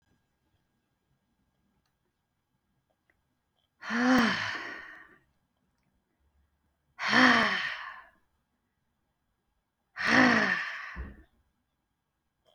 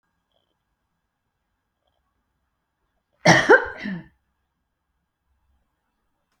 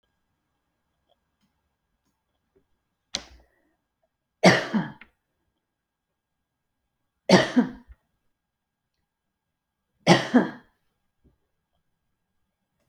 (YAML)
exhalation_length: 12.5 s
exhalation_amplitude: 14418
exhalation_signal_mean_std_ratio: 0.34
cough_length: 6.4 s
cough_amplitude: 28147
cough_signal_mean_std_ratio: 0.19
three_cough_length: 12.9 s
three_cough_amplitude: 27765
three_cough_signal_mean_std_ratio: 0.2
survey_phase: beta (2021-08-13 to 2022-03-07)
age: 45-64
gender: Female
wearing_mask: 'No'
symptom_runny_or_blocked_nose: true
symptom_headache: true
smoker_status: Ex-smoker
respiratory_condition_asthma: false
respiratory_condition_other: false
recruitment_source: REACT
submission_delay: 3 days
covid_test_result: Negative
covid_test_method: RT-qPCR